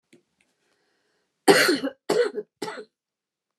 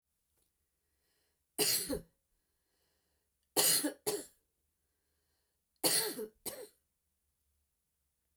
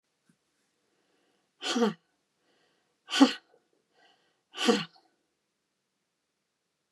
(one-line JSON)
{"cough_length": "3.6 s", "cough_amplitude": 24949, "cough_signal_mean_std_ratio": 0.33, "three_cough_length": "8.4 s", "three_cough_amplitude": 5505, "three_cough_signal_mean_std_ratio": 0.31, "exhalation_length": "6.9 s", "exhalation_amplitude": 16751, "exhalation_signal_mean_std_ratio": 0.23, "survey_phase": "beta (2021-08-13 to 2022-03-07)", "age": "65+", "gender": "Female", "wearing_mask": "No", "symptom_none": true, "smoker_status": "Never smoked", "respiratory_condition_asthma": false, "respiratory_condition_other": false, "recruitment_source": "REACT", "submission_delay": "3 days", "covid_test_result": "Negative", "covid_test_method": "RT-qPCR"}